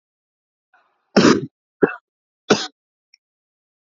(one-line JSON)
{"three_cough_length": "3.8 s", "three_cough_amplitude": 29770, "three_cough_signal_mean_std_ratio": 0.25, "survey_phase": "alpha (2021-03-01 to 2021-08-12)", "age": "18-44", "gender": "Male", "wearing_mask": "No", "symptom_fatigue": true, "symptom_change_to_sense_of_smell_or_taste": true, "symptom_loss_of_taste": true, "symptom_onset": "6 days", "smoker_status": "Ex-smoker", "respiratory_condition_asthma": false, "respiratory_condition_other": false, "recruitment_source": "Test and Trace", "submission_delay": "3 days", "covid_test_result": "Positive", "covid_test_method": "RT-qPCR", "covid_ct_value": 17.7, "covid_ct_gene": "ORF1ab gene", "covid_ct_mean": 19.0, "covid_viral_load": "600000 copies/ml", "covid_viral_load_category": "Low viral load (10K-1M copies/ml)"}